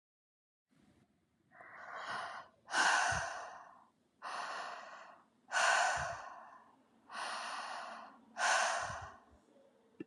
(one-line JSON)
{"exhalation_length": "10.1 s", "exhalation_amplitude": 4095, "exhalation_signal_mean_std_ratio": 0.5, "survey_phase": "beta (2021-08-13 to 2022-03-07)", "age": "18-44", "gender": "Female", "wearing_mask": "No", "symptom_none": true, "smoker_status": "Never smoked", "respiratory_condition_asthma": false, "respiratory_condition_other": false, "recruitment_source": "REACT", "submission_delay": "2 days", "covid_test_result": "Negative", "covid_test_method": "RT-qPCR", "influenza_a_test_result": "Negative", "influenza_b_test_result": "Negative"}